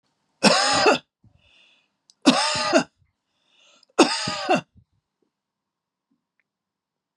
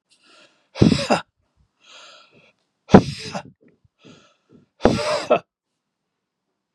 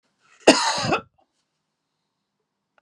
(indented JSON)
{
  "three_cough_length": "7.2 s",
  "three_cough_amplitude": 29145,
  "three_cough_signal_mean_std_ratio": 0.36,
  "exhalation_length": "6.7 s",
  "exhalation_amplitude": 32768,
  "exhalation_signal_mean_std_ratio": 0.26,
  "cough_length": "2.8 s",
  "cough_amplitude": 32768,
  "cough_signal_mean_std_ratio": 0.28,
  "survey_phase": "beta (2021-08-13 to 2022-03-07)",
  "age": "65+",
  "gender": "Male",
  "wearing_mask": "No",
  "symptom_none": true,
  "symptom_onset": "4 days",
  "smoker_status": "Never smoked",
  "respiratory_condition_asthma": false,
  "respiratory_condition_other": false,
  "recruitment_source": "Test and Trace",
  "submission_delay": "1 day",
  "covid_test_result": "Positive",
  "covid_test_method": "RT-qPCR",
  "covid_ct_value": 27.0,
  "covid_ct_gene": "N gene",
  "covid_ct_mean": 27.2,
  "covid_viral_load": "1200 copies/ml",
  "covid_viral_load_category": "Minimal viral load (< 10K copies/ml)"
}